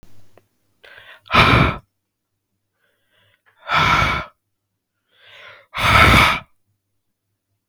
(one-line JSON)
{"exhalation_length": "7.7 s", "exhalation_amplitude": 32768, "exhalation_signal_mean_std_ratio": 0.37, "survey_phase": "beta (2021-08-13 to 2022-03-07)", "age": "18-44", "gender": "Male", "wearing_mask": "No", "symptom_none": true, "smoker_status": "Ex-smoker", "respiratory_condition_asthma": false, "respiratory_condition_other": false, "recruitment_source": "REACT", "submission_delay": "2 days", "covid_test_result": "Negative", "covid_test_method": "RT-qPCR", "influenza_a_test_result": "Negative", "influenza_b_test_result": "Negative"}